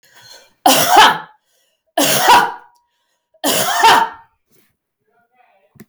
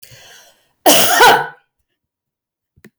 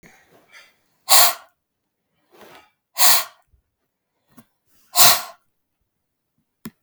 {
  "three_cough_length": "5.9 s",
  "three_cough_amplitude": 32768,
  "three_cough_signal_mean_std_ratio": 0.45,
  "cough_length": "3.0 s",
  "cough_amplitude": 32768,
  "cough_signal_mean_std_ratio": 0.39,
  "exhalation_length": "6.8 s",
  "exhalation_amplitude": 32768,
  "exhalation_signal_mean_std_ratio": 0.26,
  "survey_phase": "beta (2021-08-13 to 2022-03-07)",
  "age": "45-64",
  "gender": "Male",
  "wearing_mask": "No",
  "symptom_none": true,
  "smoker_status": "Ex-smoker",
  "respiratory_condition_asthma": false,
  "respiratory_condition_other": false,
  "recruitment_source": "Test and Trace",
  "submission_delay": "1 day",
  "covid_test_result": "Negative",
  "covid_test_method": "RT-qPCR"
}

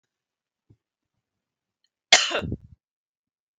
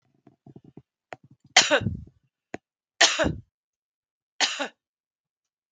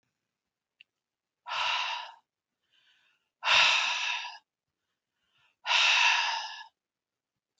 {
  "cough_length": "3.6 s",
  "cough_amplitude": 32768,
  "cough_signal_mean_std_ratio": 0.19,
  "three_cough_length": "5.7 s",
  "three_cough_amplitude": 32768,
  "three_cough_signal_mean_std_ratio": 0.27,
  "exhalation_length": "7.6 s",
  "exhalation_amplitude": 11057,
  "exhalation_signal_mean_std_ratio": 0.42,
  "survey_phase": "beta (2021-08-13 to 2022-03-07)",
  "age": "45-64",
  "gender": "Female",
  "wearing_mask": "No",
  "symptom_none": true,
  "smoker_status": "Ex-smoker",
  "respiratory_condition_asthma": false,
  "respiratory_condition_other": false,
  "recruitment_source": "REACT",
  "submission_delay": "1 day",
  "covid_test_result": "Negative",
  "covid_test_method": "RT-qPCR"
}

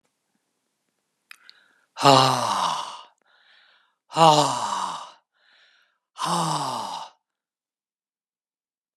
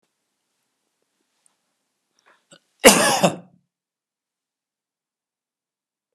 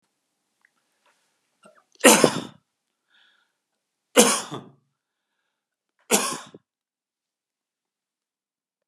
{
  "exhalation_length": "9.0 s",
  "exhalation_amplitude": 32622,
  "exhalation_signal_mean_std_ratio": 0.35,
  "cough_length": "6.1 s",
  "cough_amplitude": 32768,
  "cough_signal_mean_std_ratio": 0.19,
  "three_cough_length": "8.9 s",
  "three_cough_amplitude": 32767,
  "three_cough_signal_mean_std_ratio": 0.21,
  "survey_phase": "beta (2021-08-13 to 2022-03-07)",
  "age": "45-64",
  "gender": "Male",
  "wearing_mask": "No",
  "symptom_none": true,
  "smoker_status": "Never smoked",
  "respiratory_condition_asthma": false,
  "respiratory_condition_other": false,
  "recruitment_source": "REACT",
  "submission_delay": "3 days",
  "covid_test_result": "Negative",
  "covid_test_method": "RT-qPCR",
  "influenza_a_test_result": "Negative",
  "influenza_b_test_result": "Negative"
}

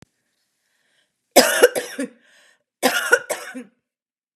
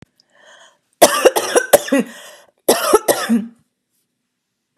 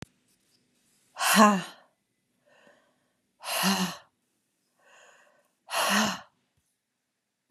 {
  "three_cough_length": "4.4 s",
  "three_cough_amplitude": 32768,
  "three_cough_signal_mean_std_ratio": 0.32,
  "cough_length": "4.8 s",
  "cough_amplitude": 32768,
  "cough_signal_mean_std_ratio": 0.39,
  "exhalation_length": "7.5 s",
  "exhalation_amplitude": 20810,
  "exhalation_signal_mean_std_ratio": 0.32,
  "survey_phase": "beta (2021-08-13 to 2022-03-07)",
  "age": "45-64",
  "gender": "Female",
  "wearing_mask": "No",
  "symptom_none": true,
  "symptom_onset": "13 days",
  "smoker_status": "Never smoked",
  "respiratory_condition_asthma": false,
  "respiratory_condition_other": false,
  "recruitment_source": "REACT",
  "submission_delay": "2 days",
  "covid_test_result": "Negative",
  "covid_test_method": "RT-qPCR",
  "influenza_a_test_result": "Negative",
  "influenza_b_test_result": "Negative"
}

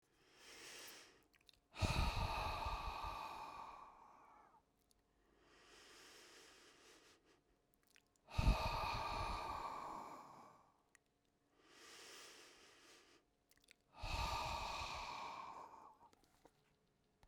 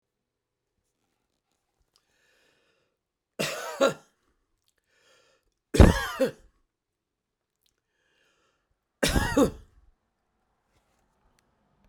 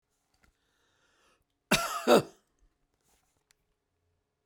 {
  "exhalation_length": "17.3 s",
  "exhalation_amplitude": 2605,
  "exhalation_signal_mean_std_ratio": 0.47,
  "three_cough_length": "11.9 s",
  "three_cough_amplitude": 28835,
  "three_cough_signal_mean_std_ratio": 0.21,
  "cough_length": "4.5 s",
  "cough_amplitude": 11546,
  "cough_signal_mean_std_ratio": 0.22,
  "survey_phase": "beta (2021-08-13 to 2022-03-07)",
  "age": "65+",
  "gender": "Male",
  "wearing_mask": "No",
  "symptom_none": true,
  "smoker_status": "Ex-smoker",
  "respiratory_condition_asthma": false,
  "respiratory_condition_other": false,
  "recruitment_source": "REACT",
  "submission_delay": "1 day",
  "covid_test_result": "Negative",
  "covid_test_method": "RT-qPCR"
}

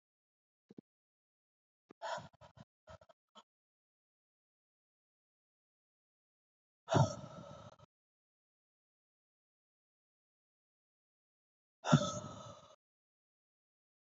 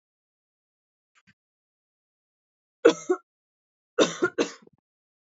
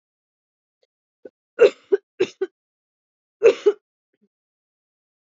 {
  "exhalation_length": "14.2 s",
  "exhalation_amplitude": 6555,
  "exhalation_signal_mean_std_ratio": 0.17,
  "three_cough_length": "5.4 s",
  "three_cough_amplitude": 22576,
  "three_cough_signal_mean_std_ratio": 0.21,
  "cough_length": "5.2 s",
  "cough_amplitude": 26369,
  "cough_signal_mean_std_ratio": 0.22,
  "survey_phase": "beta (2021-08-13 to 2022-03-07)",
  "age": "18-44",
  "gender": "Female",
  "wearing_mask": "No",
  "symptom_cough_any": true,
  "symptom_runny_or_blocked_nose": true,
  "symptom_fatigue": true,
  "symptom_headache": true,
  "symptom_onset": "5 days",
  "smoker_status": "Ex-smoker",
  "respiratory_condition_asthma": false,
  "respiratory_condition_other": false,
  "recruitment_source": "Test and Trace",
  "submission_delay": "2 days",
  "covid_test_result": "Positive",
  "covid_test_method": "ePCR"
}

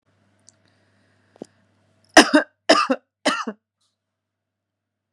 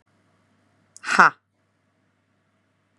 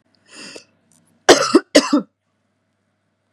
{
  "three_cough_length": "5.1 s",
  "three_cough_amplitude": 32768,
  "three_cough_signal_mean_std_ratio": 0.23,
  "exhalation_length": "3.0 s",
  "exhalation_amplitude": 32662,
  "exhalation_signal_mean_std_ratio": 0.18,
  "cough_length": "3.3 s",
  "cough_amplitude": 32768,
  "cough_signal_mean_std_ratio": 0.28,
  "survey_phase": "beta (2021-08-13 to 2022-03-07)",
  "age": "18-44",
  "gender": "Female",
  "wearing_mask": "No",
  "symptom_sore_throat": true,
  "symptom_headache": true,
  "symptom_onset": "7 days",
  "smoker_status": "Ex-smoker",
  "respiratory_condition_asthma": true,
  "respiratory_condition_other": false,
  "recruitment_source": "Test and Trace",
  "submission_delay": "1 day",
  "covid_test_result": "Positive",
  "covid_test_method": "RT-qPCR",
  "covid_ct_value": 20.2,
  "covid_ct_gene": "ORF1ab gene",
  "covid_ct_mean": 20.7,
  "covid_viral_load": "160000 copies/ml",
  "covid_viral_load_category": "Low viral load (10K-1M copies/ml)"
}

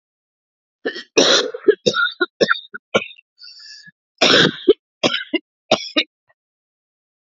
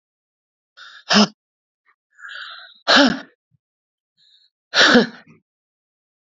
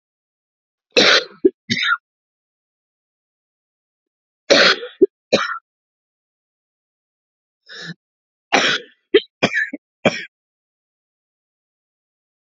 {
  "cough_length": "7.3 s",
  "cough_amplitude": 32433,
  "cough_signal_mean_std_ratio": 0.38,
  "exhalation_length": "6.4 s",
  "exhalation_amplitude": 28915,
  "exhalation_signal_mean_std_ratio": 0.29,
  "three_cough_length": "12.5 s",
  "three_cough_amplitude": 32768,
  "three_cough_signal_mean_std_ratio": 0.28,
  "survey_phase": "alpha (2021-03-01 to 2021-08-12)",
  "age": "45-64",
  "gender": "Female",
  "wearing_mask": "No",
  "symptom_cough_any": true,
  "symptom_fatigue": true,
  "symptom_headache": true,
  "symptom_change_to_sense_of_smell_or_taste": true,
  "symptom_onset": "5 days",
  "smoker_status": "Ex-smoker",
  "respiratory_condition_asthma": false,
  "respiratory_condition_other": false,
  "recruitment_source": "Test and Trace",
  "submission_delay": "1 day",
  "covid_test_result": "Positive",
  "covid_test_method": "RT-qPCR",
  "covid_ct_value": 27.1,
  "covid_ct_gene": "ORF1ab gene",
  "covid_ct_mean": 27.8,
  "covid_viral_load": "750 copies/ml",
  "covid_viral_load_category": "Minimal viral load (< 10K copies/ml)"
}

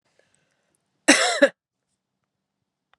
{
  "cough_length": "3.0 s",
  "cough_amplitude": 31930,
  "cough_signal_mean_std_ratio": 0.25,
  "survey_phase": "beta (2021-08-13 to 2022-03-07)",
  "age": "18-44",
  "gender": "Female",
  "wearing_mask": "No",
  "symptom_cough_any": true,
  "symptom_runny_or_blocked_nose": true,
  "symptom_abdominal_pain": true,
  "symptom_fatigue": true,
  "symptom_headache": true,
  "symptom_change_to_sense_of_smell_or_taste": true,
  "symptom_onset": "6 days",
  "smoker_status": "Never smoked",
  "respiratory_condition_asthma": true,
  "respiratory_condition_other": false,
  "recruitment_source": "REACT",
  "submission_delay": "2 days",
  "covid_test_result": "Positive",
  "covid_test_method": "RT-qPCR",
  "covid_ct_value": 23.0,
  "covid_ct_gene": "E gene"
}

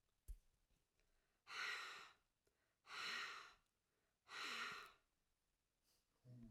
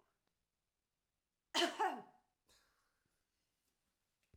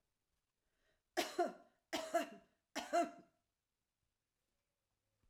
{
  "exhalation_length": "6.5 s",
  "exhalation_amplitude": 433,
  "exhalation_signal_mean_std_ratio": 0.48,
  "cough_length": "4.4 s",
  "cough_amplitude": 2446,
  "cough_signal_mean_std_ratio": 0.24,
  "three_cough_length": "5.3 s",
  "three_cough_amplitude": 1775,
  "three_cough_signal_mean_std_ratio": 0.31,
  "survey_phase": "alpha (2021-03-01 to 2021-08-12)",
  "age": "65+",
  "gender": "Female",
  "wearing_mask": "No",
  "symptom_cough_any": true,
  "smoker_status": "Never smoked",
  "respiratory_condition_asthma": false,
  "respiratory_condition_other": false,
  "recruitment_source": "REACT",
  "submission_delay": "2 days",
  "covid_test_result": "Negative",
  "covid_test_method": "RT-qPCR"
}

